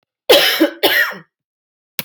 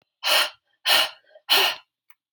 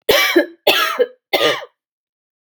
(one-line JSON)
{"cough_length": "2.0 s", "cough_amplitude": 32768, "cough_signal_mean_std_ratio": 0.48, "exhalation_length": "2.3 s", "exhalation_amplitude": 17203, "exhalation_signal_mean_std_ratio": 0.47, "three_cough_length": "2.4 s", "three_cough_amplitude": 31511, "three_cough_signal_mean_std_ratio": 0.54, "survey_phase": "alpha (2021-03-01 to 2021-08-12)", "age": "18-44", "gender": "Female", "wearing_mask": "No", "symptom_cough_any": true, "symptom_shortness_of_breath": true, "symptom_fatigue": true, "symptom_change_to_sense_of_smell_or_taste": true, "symptom_loss_of_taste": true, "symptom_onset": "4 days", "smoker_status": "Never smoked", "respiratory_condition_asthma": true, "respiratory_condition_other": false, "recruitment_source": "Test and Trace", "submission_delay": "2 days", "covid_test_result": "Positive", "covid_test_method": "RT-qPCR", "covid_ct_value": 15.8, "covid_ct_gene": "N gene", "covid_ct_mean": 16.2, "covid_viral_load": "5000000 copies/ml", "covid_viral_load_category": "High viral load (>1M copies/ml)"}